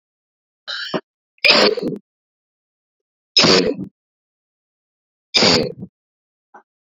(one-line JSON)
{"three_cough_length": "6.8 s", "three_cough_amplitude": 32767, "three_cough_signal_mean_std_ratio": 0.35, "survey_phase": "beta (2021-08-13 to 2022-03-07)", "age": "45-64", "gender": "Female", "wearing_mask": "No", "symptom_cough_any": true, "symptom_runny_or_blocked_nose": true, "symptom_shortness_of_breath": true, "symptom_fatigue": true, "smoker_status": "Ex-smoker", "respiratory_condition_asthma": true, "respiratory_condition_other": false, "recruitment_source": "Test and Trace", "submission_delay": "2 days", "covid_test_method": "RT-qPCR", "covid_ct_value": 21.2, "covid_ct_gene": "ORF1ab gene"}